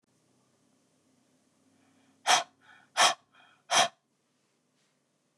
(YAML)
exhalation_length: 5.4 s
exhalation_amplitude: 11438
exhalation_signal_mean_std_ratio: 0.24
survey_phase: beta (2021-08-13 to 2022-03-07)
age: 45-64
gender: Female
wearing_mask: 'No'
symptom_none: true
smoker_status: Never smoked
respiratory_condition_asthma: false
respiratory_condition_other: false
recruitment_source: REACT
submission_delay: 1 day
covid_test_result: Negative
covid_test_method: RT-qPCR
influenza_a_test_result: Negative
influenza_b_test_result: Negative